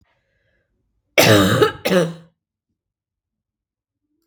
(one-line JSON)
{"cough_length": "4.3 s", "cough_amplitude": 32767, "cough_signal_mean_std_ratio": 0.34, "survey_phase": "beta (2021-08-13 to 2022-03-07)", "age": "18-44", "gender": "Female", "wearing_mask": "No", "symptom_cough_any": true, "symptom_runny_or_blocked_nose": true, "symptom_sore_throat": true, "smoker_status": "Never smoked", "respiratory_condition_asthma": false, "respiratory_condition_other": false, "recruitment_source": "Test and Trace", "submission_delay": "1 day", "covid_test_result": "Positive", "covid_test_method": "LFT"}